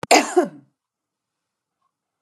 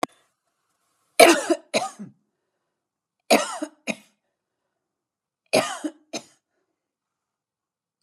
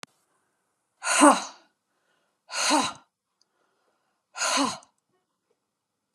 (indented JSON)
{
  "cough_length": "2.2 s",
  "cough_amplitude": 31485,
  "cough_signal_mean_std_ratio": 0.27,
  "three_cough_length": "8.0 s",
  "three_cough_amplitude": 32767,
  "three_cough_signal_mean_std_ratio": 0.24,
  "exhalation_length": "6.1 s",
  "exhalation_amplitude": 25925,
  "exhalation_signal_mean_std_ratio": 0.3,
  "survey_phase": "beta (2021-08-13 to 2022-03-07)",
  "age": "65+",
  "gender": "Female",
  "wearing_mask": "No",
  "symptom_none": true,
  "smoker_status": "Never smoked",
  "respiratory_condition_asthma": false,
  "respiratory_condition_other": false,
  "recruitment_source": "REACT",
  "submission_delay": "2 days",
  "covid_test_result": "Negative",
  "covid_test_method": "RT-qPCR"
}